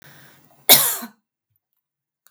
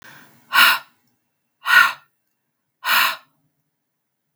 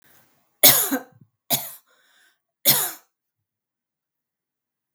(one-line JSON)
{"cough_length": "2.3 s", "cough_amplitude": 32768, "cough_signal_mean_std_ratio": 0.25, "exhalation_length": "4.4 s", "exhalation_amplitude": 32768, "exhalation_signal_mean_std_ratio": 0.34, "three_cough_length": "4.9 s", "three_cough_amplitude": 32768, "three_cough_signal_mean_std_ratio": 0.26, "survey_phase": "beta (2021-08-13 to 2022-03-07)", "age": "45-64", "gender": "Female", "wearing_mask": "No", "symptom_none": true, "smoker_status": "Never smoked", "respiratory_condition_asthma": false, "respiratory_condition_other": false, "recruitment_source": "REACT", "submission_delay": "1 day", "covid_test_result": "Negative", "covid_test_method": "RT-qPCR"}